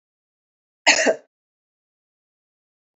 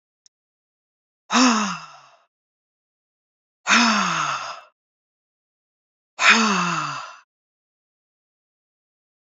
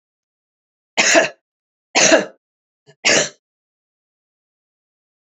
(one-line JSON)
{"cough_length": "3.0 s", "cough_amplitude": 27920, "cough_signal_mean_std_ratio": 0.22, "exhalation_length": "9.3 s", "exhalation_amplitude": 29302, "exhalation_signal_mean_std_ratio": 0.36, "three_cough_length": "5.4 s", "three_cough_amplitude": 30452, "three_cough_signal_mean_std_ratio": 0.3, "survey_phase": "beta (2021-08-13 to 2022-03-07)", "age": "65+", "gender": "Female", "wearing_mask": "No", "symptom_none": true, "smoker_status": "Never smoked", "respiratory_condition_asthma": false, "respiratory_condition_other": false, "recruitment_source": "Test and Trace", "submission_delay": "0 days", "covid_test_result": "Negative", "covid_test_method": "LFT"}